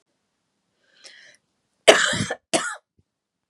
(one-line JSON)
{"cough_length": "3.5 s", "cough_amplitude": 32768, "cough_signal_mean_std_ratio": 0.26, "survey_phase": "beta (2021-08-13 to 2022-03-07)", "age": "45-64", "gender": "Female", "wearing_mask": "No", "symptom_cough_any": true, "symptom_runny_or_blocked_nose": true, "symptom_sore_throat": true, "symptom_fever_high_temperature": true, "symptom_headache": true, "smoker_status": "Never smoked", "respiratory_condition_asthma": false, "respiratory_condition_other": false, "recruitment_source": "Test and Trace", "submission_delay": "-1 day", "covid_test_result": "Positive", "covid_test_method": "LFT"}